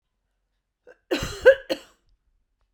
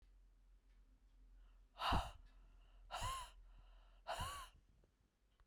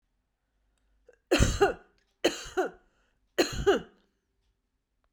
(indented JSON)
{
  "cough_length": "2.7 s",
  "cough_amplitude": 26339,
  "cough_signal_mean_std_ratio": 0.23,
  "exhalation_length": "5.5 s",
  "exhalation_amplitude": 1610,
  "exhalation_signal_mean_std_ratio": 0.43,
  "three_cough_length": "5.1 s",
  "three_cough_amplitude": 11054,
  "three_cough_signal_mean_std_ratio": 0.33,
  "survey_phase": "beta (2021-08-13 to 2022-03-07)",
  "age": "45-64",
  "gender": "Female",
  "wearing_mask": "No",
  "symptom_none": true,
  "symptom_onset": "4 days",
  "smoker_status": "Never smoked",
  "respiratory_condition_asthma": false,
  "respiratory_condition_other": false,
  "recruitment_source": "REACT",
  "submission_delay": "1 day",
  "covid_test_result": "Negative",
  "covid_test_method": "RT-qPCR",
  "covid_ct_value": 39.0,
  "covid_ct_gene": "N gene",
  "influenza_a_test_result": "Negative",
  "influenza_b_test_result": "Negative"
}